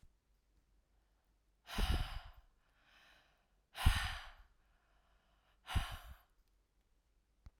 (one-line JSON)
{"exhalation_length": "7.6 s", "exhalation_amplitude": 4754, "exhalation_signal_mean_std_ratio": 0.29, "survey_phase": "alpha (2021-03-01 to 2021-08-12)", "age": "45-64", "gender": "Female", "wearing_mask": "No", "symptom_none": true, "smoker_status": "Never smoked", "respiratory_condition_asthma": false, "respiratory_condition_other": false, "recruitment_source": "REACT", "submission_delay": "10 days", "covid_test_result": "Negative", "covid_test_method": "RT-qPCR"}